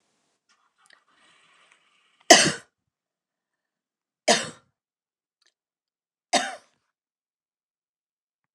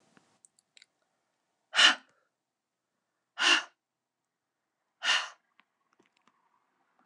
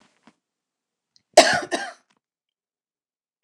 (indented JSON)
{
  "three_cough_length": "8.5 s",
  "three_cough_amplitude": 29204,
  "three_cough_signal_mean_std_ratio": 0.17,
  "exhalation_length": "7.1 s",
  "exhalation_amplitude": 14141,
  "exhalation_signal_mean_std_ratio": 0.22,
  "cough_length": "3.4 s",
  "cough_amplitude": 29204,
  "cough_signal_mean_std_ratio": 0.2,
  "survey_phase": "alpha (2021-03-01 to 2021-08-12)",
  "age": "45-64",
  "gender": "Female",
  "wearing_mask": "No",
  "symptom_none": true,
  "smoker_status": "Ex-smoker",
  "respiratory_condition_asthma": false,
  "respiratory_condition_other": false,
  "recruitment_source": "REACT",
  "submission_delay": "1 day",
  "covid_test_result": "Negative",
  "covid_test_method": "RT-qPCR"
}